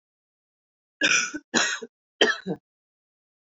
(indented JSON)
{
  "three_cough_length": "3.5 s",
  "three_cough_amplitude": 18327,
  "three_cough_signal_mean_std_ratio": 0.36,
  "survey_phase": "beta (2021-08-13 to 2022-03-07)",
  "age": "18-44",
  "gender": "Female",
  "wearing_mask": "No",
  "symptom_cough_any": true,
  "symptom_runny_or_blocked_nose": true,
  "symptom_sore_throat": true,
  "symptom_fatigue": true,
  "symptom_headache": true,
  "smoker_status": "Never smoked",
  "respiratory_condition_asthma": true,
  "respiratory_condition_other": false,
  "recruitment_source": "Test and Trace",
  "submission_delay": "1 day",
  "covid_test_result": "Positive",
  "covid_test_method": "ePCR"
}